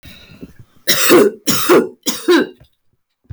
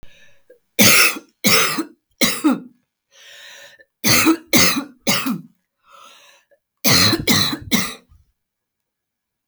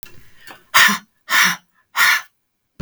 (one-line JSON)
{"cough_length": "3.3 s", "cough_amplitude": 32768, "cough_signal_mean_std_ratio": 0.52, "three_cough_length": "9.5 s", "three_cough_amplitude": 32768, "three_cough_signal_mean_std_ratio": 0.46, "exhalation_length": "2.8 s", "exhalation_amplitude": 32768, "exhalation_signal_mean_std_ratio": 0.43, "survey_phase": "beta (2021-08-13 to 2022-03-07)", "age": "45-64", "gender": "Female", "wearing_mask": "No", "symptom_fatigue": true, "symptom_headache": true, "smoker_status": "Never smoked", "respiratory_condition_asthma": true, "respiratory_condition_other": false, "recruitment_source": "REACT", "submission_delay": "2 days", "covid_test_result": "Negative", "covid_test_method": "RT-qPCR"}